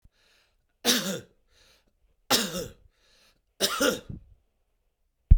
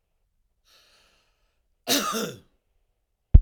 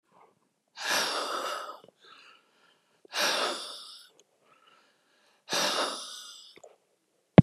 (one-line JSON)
{"three_cough_length": "5.4 s", "three_cough_amplitude": 24801, "three_cough_signal_mean_std_ratio": 0.29, "cough_length": "3.4 s", "cough_amplitude": 32768, "cough_signal_mean_std_ratio": 0.2, "exhalation_length": "7.4 s", "exhalation_amplitude": 31361, "exhalation_signal_mean_std_ratio": 0.3, "survey_phase": "beta (2021-08-13 to 2022-03-07)", "age": "65+", "gender": "Male", "wearing_mask": "No", "symptom_none": true, "smoker_status": "Ex-smoker", "respiratory_condition_asthma": false, "respiratory_condition_other": false, "recruitment_source": "REACT", "submission_delay": "1 day", "covid_test_result": "Negative", "covid_test_method": "RT-qPCR"}